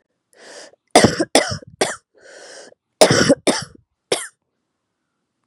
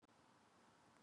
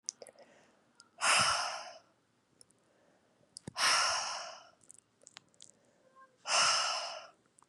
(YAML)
cough_length: 5.5 s
cough_amplitude: 32768
cough_signal_mean_std_ratio: 0.33
three_cough_length: 1.0 s
three_cough_amplitude: 64
three_cough_signal_mean_std_ratio: 1.13
exhalation_length: 7.7 s
exhalation_amplitude: 5993
exhalation_signal_mean_std_ratio: 0.42
survey_phase: beta (2021-08-13 to 2022-03-07)
age: 18-44
gender: Female
wearing_mask: 'No'
symptom_cough_any: true
symptom_runny_or_blocked_nose: true
symptom_sore_throat: true
symptom_headache: true
symptom_onset: 3 days
smoker_status: Never smoked
respiratory_condition_asthma: false
respiratory_condition_other: false
recruitment_source: Test and Trace
submission_delay: 1 day
covid_test_result: Positive
covid_test_method: RT-qPCR
covid_ct_value: 23.3
covid_ct_gene: ORF1ab gene